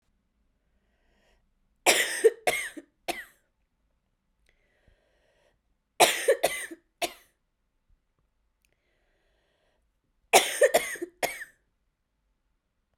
{"three_cough_length": "13.0 s", "three_cough_amplitude": 26251, "three_cough_signal_mean_std_ratio": 0.26, "survey_phase": "beta (2021-08-13 to 2022-03-07)", "age": "18-44", "gender": "Female", "wearing_mask": "No", "symptom_cough_any": true, "symptom_runny_or_blocked_nose": true, "symptom_shortness_of_breath": true, "symptom_sore_throat": true, "symptom_diarrhoea": true, "symptom_fatigue": true, "symptom_change_to_sense_of_smell_or_taste": true, "symptom_loss_of_taste": true, "symptom_other": true, "symptom_onset": "4 days", "smoker_status": "Never smoked", "respiratory_condition_asthma": false, "respiratory_condition_other": false, "recruitment_source": "Test and Trace", "submission_delay": "1 day", "covid_test_result": "Positive", "covid_test_method": "RT-qPCR", "covid_ct_value": 15.3, "covid_ct_gene": "N gene", "covid_ct_mean": 16.5, "covid_viral_load": "3800000 copies/ml", "covid_viral_load_category": "High viral load (>1M copies/ml)"}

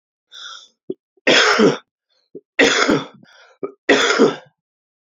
{"three_cough_length": "5.0 s", "three_cough_amplitude": 30381, "three_cough_signal_mean_std_ratio": 0.45, "survey_phase": "beta (2021-08-13 to 2022-03-07)", "age": "65+", "gender": "Male", "wearing_mask": "No", "symptom_cough_any": true, "symptom_runny_or_blocked_nose": true, "symptom_shortness_of_breath": true, "symptom_sore_throat": true, "symptom_change_to_sense_of_smell_or_taste": true, "symptom_loss_of_taste": true, "symptom_onset": "4 days", "smoker_status": "Ex-smoker", "respiratory_condition_asthma": false, "respiratory_condition_other": false, "recruitment_source": "Test and Trace", "submission_delay": "2 days", "covid_test_result": "Positive", "covid_test_method": "RT-qPCR", "covid_ct_value": 20.1, "covid_ct_gene": "ORF1ab gene"}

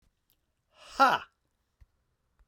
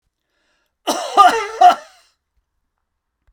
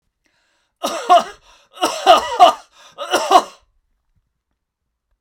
{"exhalation_length": "2.5 s", "exhalation_amplitude": 11318, "exhalation_signal_mean_std_ratio": 0.22, "cough_length": "3.3 s", "cough_amplitude": 32768, "cough_signal_mean_std_ratio": 0.32, "three_cough_length": "5.2 s", "three_cough_amplitude": 32768, "three_cough_signal_mean_std_ratio": 0.35, "survey_phase": "beta (2021-08-13 to 2022-03-07)", "age": "45-64", "gender": "Male", "wearing_mask": "No", "symptom_none": true, "smoker_status": "Never smoked", "respiratory_condition_asthma": false, "respiratory_condition_other": false, "recruitment_source": "REACT", "submission_delay": "1 day", "covid_test_result": "Negative", "covid_test_method": "RT-qPCR"}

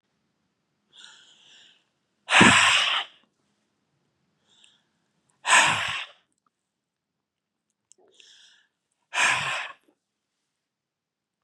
{"exhalation_length": "11.4 s", "exhalation_amplitude": 26615, "exhalation_signal_mean_std_ratio": 0.29, "survey_phase": "beta (2021-08-13 to 2022-03-07)", "age": "65+", "gender": "Male", "wearing_mask": "No", "symptom_cough_any": true, "symptom_onset": "6 days", "smoker_status": "Never smoked", "respiratory_condition_asthma": false, "respiratory_condition_other": false, "recruitment_source": "REACT", "submission_delay": "1 day", "covid_test_result": "Positive", "covid_test_method": "RT-qPCR", "covid_ct_value": 22.5, "covid_ct_gene": "E gene", "influenza_a_test_result": "Negative", "influenza_b_test_result": "Negative"}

